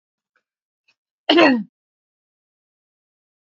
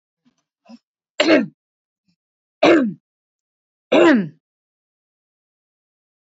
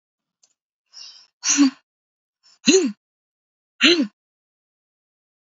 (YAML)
cough_length: 3.6 s
cough_amplitude: 32768
cough_signal_mean_std_ratio: 0.24
three_cough_length: 6.4 s
three_cough_amplitude: 29011
three_cough_signal_mean_std_ratio: 0.3
exhalation_length: 5.5 s
exhalation_amplitude: 28146
exhalation_signal_mean_std_ratio: 0.3
survey_phase: beta (2021-08-13 to 2022-03-07)
age: 45-64
gender: Female
wearing_mask: 'No'
symptom_none: true
smoker_status: Never smoked
respiratory_condition_asthma: true
respiratory_condition_other: false
recruitment_source: REACT
submission_delay: 1 day
covid_test_result: Negative
covid_test_method: RT-qPCR
influenza_a_test_result: Negative
influenza_b_test_result: Negative